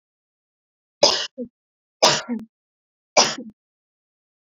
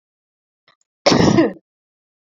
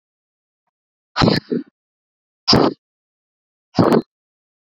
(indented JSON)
{
  "three_cough_length": "4.4 s",
  "three_cough_amplitude": 32577,
  "three_cough_signal_mean_std_ratio": 0.29,
  "cough_length": "2.3 s",
  "cough_amplitude": 27959,
  "cough_signal_mean_std_ratio": 0.35,
  "exhalation_length": "4.8 s",
  "exhalation_amplitude": 30980,
  "exhalation_signal_mean_std_ratio": 0.31,
  "survey_phase": "beta (2021-08-13 to 2022-03-07)",
  "age": "18-44",
  "gender": "Female",
  "wearing_mask": "No",
  "symptom_none": true,
  "smoker_status": "Current smoker (1 to 10 cigarettes per day)",
  "respiratory_condition_asthma": false,
  "respiratory_condition_other": false,
  "recruitment_source": "REACT",
  "submission_delay": "0 days",
  "covid_test_result": "Negative",
  "covid_test_method": "RT-qPCR"
}